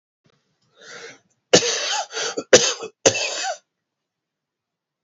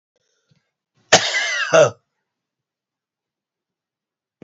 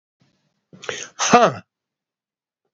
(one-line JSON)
{"three_cough_length": "5.0 s", "three_cough_amplitude": 31123, "three_cough_signal_mean_std_ratio": 0.34, "cough_length": "4.4 s", "cough_amplitude": 30963, "cough_signal_mean_std_ratio": 0.28, "exhalation_length": "2.7 s", "exhalation_amplitude": 32767, "exhalation_signal_mean_std_ratio": 0.27, "survey_phase": "beta (2021-08-13 to 2022-03-07)", "age": "65+", "gender": "Male", "wearing_mask": "No", "symptom_none": true, "smoker_status": "Current smoker (1 to 10 cigarettes per day)", "respiratory_condition_asthma": false, "respiratory_condition_other": false, "recruitment_source": "REACT", "submission_delay": "2 days", "covid_test_result": "Negative", "covid_test_method": "RT-qPCR", "influenza_a_test_result": "Negative", "influenza_b_test_result": "Negative"}